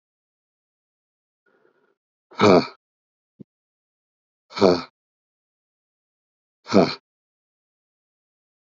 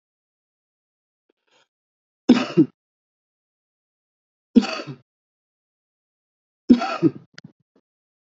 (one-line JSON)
{"exhalation_length": "8.7 s", "exhalation_amplitude": 32170, "exhalation_signal_mean_std_ratio": 0.2, "three_cough_length": "8.3 s", "three_cough_amplitude": 28325, "three_cough_signal_mean_std_ratio": 0.21, "survey_phase": "beta (2021-08-13 to 2022-03-07)", "age": "45-64", "gender": "Male", "wearing_mask": "No", "symptom_cough_any": true, "symptom_new_continuous_cough": true, "symptom_runny_or_blocked_nose": true, "symptom_sore_throat": true, "symptom_fatigue": true, "symptom_headache": true, "symptom_change_to_sense_of_smell_or_taste": true, "symptom_onset": "3 days", "smoker_status": "Ex-smoker", "respiratory_condition_asthma": true, "respiratory_condition_other": false, "recruitment_source": "Test and Trace", "submission_delay": "2 days", "covid_test_result": "Positive", "covid_test_method": "RT-qPCR", "covid_ct_value": 12.1, "covid_ct_gene": "ORF1ab gene", "covid_ct_mean": 12.3, "covid_viral_load": "91000000 copies/ml", "covid_viral_load_category": "High viral load (>1M copies/ml)"}